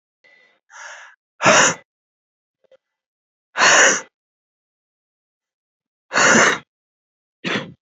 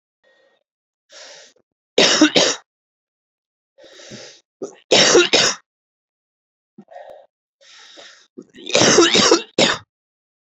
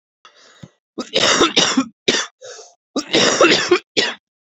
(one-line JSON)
{"exhalation_length": "7.9 s", "exhalation_amplitude": 32620, "exhalation_signal_mean_std_ratio": 0.33, "three_cough_length": "10.5 s", "three_cough_amplitude": 32768, "three_cough_signal_mean_std_ratio": 0.36, "cough_length": "4.5 s", "cough_amplitude": 31476, "cough_signal_mean_std_ratio": 0.51, "survey_phase": "beta (2021-08-13 to 2022-03-07)", "age": "18-44", "gender": "Male", "wearing_mask": "No", "symptom_cough_any": true, "symptom_runny_or_blocked_nose": true, "symptom_shortness_of_breath": true, "symptom_sore_throat": true, "symptom_fatigue": true, "symptom_fever_high_temperature": true, "symptom_headache": true, "symptom_change_to_sense_of_smell_or_taste": true, "symptom_loss_of_taste": true, "symptom_onset": "3 days", "smoker_status": "Current smoker (11 or more cigarettes per day)", "respiratory_condition_asthma": false, "respiratory_condition_other": false, "recruitment_source": "Test and Trace", "submission_delay": "2 days", "covid_test_result": "Positive", "covid_test_method": "RT-qPCR", "covid_ct_value": 25.0, "covid_ct_gene": "ORF1ab gene"}